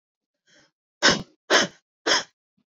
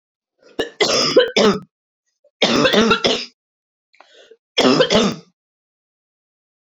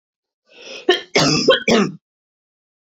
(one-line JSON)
{"exhalation_length": "2.7 s", "exhalation_amplitude": 27243, "exhalation_signal_mean_std_ratio": 0.33, "three_cough_length": "6.7 s", "three_cough_amplitude": 29008, "three_cough_signal_mean_std_ratio": 0.47, "cough_length": "2.8 s", "cough_amplitude": 26590, "cough_signal_mean_std_ratio": 0.45, "survey_phase": "beta (2021-08-13 to 2022-03-07)", "age": "18-44", "gender": "Female", "wearing_mask": "No", "symptom_runny_or_blocked_nose": true, "smoker_status": "Never smoked", "respiratory_condition_asthma": false, "respiratory_condition_other": false, "recruitment_source": "REACT", "submission_delay": "1 day", "covid_test_result": "Negative", "covid_test_method": "RT-qPCR"}